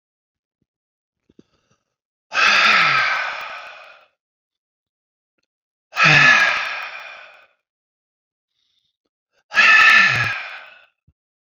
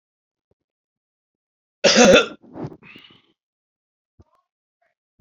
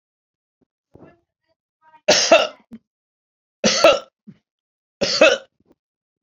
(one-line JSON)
{"exhalation_length": "11.5 s", "exhalation_amplitude": 30719, "exhalation_signal_mean_std_ratio": 0.4, "cough_length": "5.2 s", "cough_amplitude": 31741, "cough_signal_mean_std_ratio": 0.24, "three_cough_length": "6.2 s", "three_cough_amplitude": 32768, "three_cough_signal_mean_std_ratio": 0.31, "survey_phase": "beta (2021-08-13 to 2022-03-07)", "age": "65+", "gender": "Male", "wearing_mask": "No", "symptom_none": true, "smoker_status": "Never smoked", "respiratory_condition_asthma": false, "respiratory_condition_other": false, "recruitment_source": "REACT", "submission_delay": "1 day", "covid_test_result": "Negative", "covid_test_method": "RT-qPCR"}